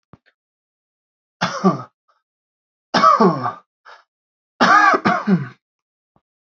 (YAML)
three_cough_length: 6.5 s
three_cough_amplitude: 29037
three_cough_signal_mean_std_ratio: 0.38
survey_phase: beta (2021-08-13 to 2022-03-07)
age: 18-44
gender: Male
wearing_mask: 'No'
symptom_none: true
smoker_status: Never smoked
respiratory_condition_asthma: false
respiratory_condition_other: false
recruitment_source: REACT
submission_delay: 1 day
covid_test_result: Negative
covid_test_method: RT-qPCR
influenza_a_test_result: Negative
influenza_b_test_result: Negative